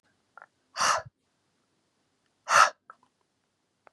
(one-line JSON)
{"exhalation_length": "3.9 s", "exhalation_amplitude": 19370, "exhalation_signal_mean_std_ratio": 0.24, "survey_phase": "beta (2021-08-13 to 2022-03-07)", "age": "18-44", "gender": "Male", "wearing_mask": "No", "symptom_none": true, "smoker_status": "Current smoker (1 to 10 cigarettes per day)", "respiratory_condition_asthma": false, "respiratory_condition_other": false, "recruitment_source": "REACT", "submission_delay": "1 day", "covid_test_result": "Negative", "covid_test_method": "RT-qPCR", "influenza_a_test_result": "Negative", "influenza_b_test_result": "Negative"}